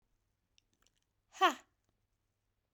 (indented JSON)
{
  "exhalation_length": "2.7 s",
  "exhalation_amplitude": 6415,
  "exhalation_signal_mean_std_ratio": 0.16,
  "survey_phase": "beta (2021-08-13 to 2022-03-07)",
  "age": "45-64",
  "gender": "Female",
  "wearing_mask": "No",
  "symptom_sore_throat": true,
  "symptom_fatigue": true,
  "symptom_onset": "9 days",
  "smoker_status": "Never smoked",
  "respiratory_condition_asthma": false,
  "respiratory_condition_other": false,
  "recruitment_source": "REACT",
  "submission_delay": "2 days",
  "covid_test_result": "Negative",
  "covid_test_method": "RT-qPCR"
}